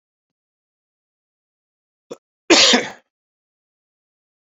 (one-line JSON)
{"cough_length": "4.4 s", "cough_amplitude": 31715, "cough_signal_mean_std_ratio": 0.22, "survey_phase": "beta (2021-08-13 to 2022-03-07)", "age": "45-64", "gender": "Male", "wearing_mask": "No", "symptom_new_continuous_cough": true, "symptom_fatigue": true, "symptom_fever_high_temperature": true, "symptom_onset": "3 days", "smoker_status": "Never smoked", "respiratory_condition_asthma": false, "respiratory_condition_other": false, "recruitment_source": "Test and Trace", "submission_delay": "1 day", "covid_test_result": "Positive", "covid_test_method": "ePCR"}